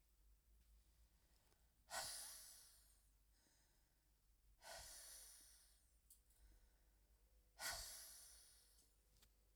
{"exhalation_length": "9.6 s", "exhalation_amplitude": 519, "exhalation_signal_mean_std_ratio": 0.5, "survey_phase": "beta (2021-08-13 to 2022-03-07)", "age": "18-44", "gender": "Female", "wearing_mask": "No", "symptom_cough_any": true, "symptom_runny_or_blocked_nose": true, "symptom_shortness_of_breath": true, "symptom_sore_throat": true, "symptom_abdominal_pain": true, "symptom_fatigue": true, "symptom_headache": true, "symptom_change_to_sense_of_smell_or_taste": true, "symptom_loss_of_taste": true, "symptom_onset": "4 days", "smoker_status": "Never smoked", "respiratory_condition_asthma": false, "respiratory_condition_other": false, "recruitment_source": "Test and Trace", "submission_delay": "1 day", "covid_test_result": "Positive", "covid_test_method": "RT-qPCR"}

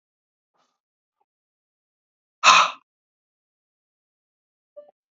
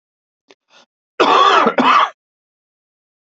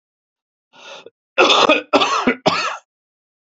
{"exhalation_length": "5.1 s", "exhalation_amplitude": 32767, "exhalation_signal_mean_std_ratio": 0.17, "cough_length": "3.2 s", "cough_amplitude": 32767, "cough_signal_mean_std_ratio": 0.43, "three_cough_length": "3.6 s", "three_cough_amplitude": 32768, "three_cough_signal_mean_std_ratio": 0.44, "survey_phase": "beta (2021-08-13 to 2022-03-07)", "age": "45-64", "gender": "Male", "wearing_mask": "No", "symptom_cough_any": true, "smoker_status": "Never smoked", "respiratory_condition_asthma": false, "respiratory_condition_other": false, "recruitment_source": "Test and Trace", "submission_delay": "0 days", "covid_test_result": "Negative", "covid_test_method": "LFT"}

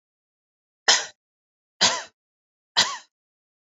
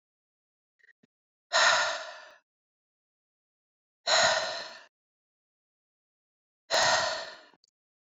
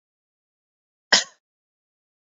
{"three_cough_length": "3.8 s", "three_cough_amplitude": 23034, "three_cough_signal_mean_std_ratio": 0.27, "exhalation_length": "8.2 s", "exhalation_amplitude": 10957, "exhalation_signal_mean_std_ratio": 0.35, "cough_length": "2.2 s", "cough_amplitude": 29327, "cough_signal_mean_std_ratio": 0.15, "survey_phase": "beta (2021-08-13 to 2022-03-07)", "age": "45-64", "gender": "Female", "wearing_mask": "No", "symptom_none": true, "smoker_status": "Ex-smoker", "respiratory_condition_asthma": false, "respiratory_condition_other": false, "recruitment_source": "REACT", "submission_delay": "1 day", "covid_test_result": "Negative", "covid_test_method": "RT-qPCR"}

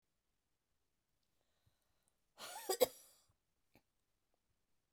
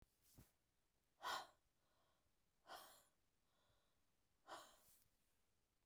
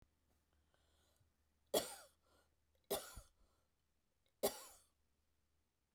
{"cough_length": "4.9 s", "cough_amplitude": 3888, "cough_signal_mean_std_ratio": 0.16, "exhalation_length": "5.9 s", "exhalation_amplitude": 496, "exhalation_signal_mean_std_ratio": 0.31, "three_cough_length": "5.9 s", "three_cough_amplitude": 2578, "three_cough_signal_mean_std_ratio": 0.23, "survey_phase": "beta (2021-08-13 to 2022-03-07)", "age": "45-64", "gender": "Female", "wearing_mask": "No", "symptom_cough_any": true, "symptom_runny_or_blocked_nose": true, "symptom_sore_throat": true, "symptom_diarrhoea": true, "symptom_fatigue": true, "symptom_headache": true, "symptom_change_to_sense_of_smell_or_taste": true, "smoker_status": "Ex-smoker", "respiratory_condition_asthma": true, "respiratory_condition_other": false, "recruitment_source": "Test and Trace", "submission_delay": "1 day", "covid_test_result": "Positive", "covid_test_method": "RT-qPCR", "covid_ct_value": 31.6, "covid_ct_gene": "ORF1ab gene"}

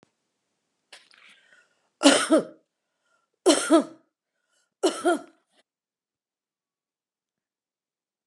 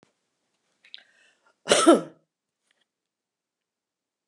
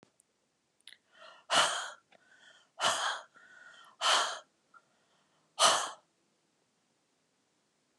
{"three_cough_length": "8.3 s", "three_cough_amplitude": 30703, "three_cough_signal_mean_std_ratio": 0.26, "cough_length": "4.3 s", "cough_amplitude": 24353, "cough_signal_mean_std_ratio": 0.2, "exhalation_length": "8.0 s", "exhalation_amplitude": 9852, "exhalation_signal_mean_std_ratio": 0.33, "survey_phase": "beta (2021-08-13 to 2022-03-07)", "age": "45-64", "gender": "Female", "wearing_mask": "No", "symptom_none": true, "smoker_status": "Never smoked", "respiratory_condition_asthma": false, "respiratory_condition_other": false, "recruitment_source": "REACT", "submission_delay": "3 days", "covid_test_result": "Negative", "covid_test_method": "RT-qPCR"}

